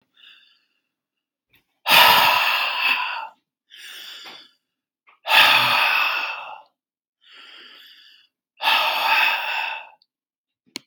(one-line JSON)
{"exhalation_length": "10.9 s", "exhalation_amplitude": 32670, "exhalation_signal_mean_std_ratio": 0.47, "survey_phase": "beta (2021-08-13 to 2022-03-07)", "age": "45-64", "gender": "Male", "wearing_mask": "No", "symptom_none": true, "smoker_status": "Never smoked", "respiratory_condition_asthma": false, "respiratory_condition_other": false, "recruitment_source": "REACT", "submission_delay": "16 days", "covid_test_result": "Negative", "covid_test_method": "RT-qPCR"}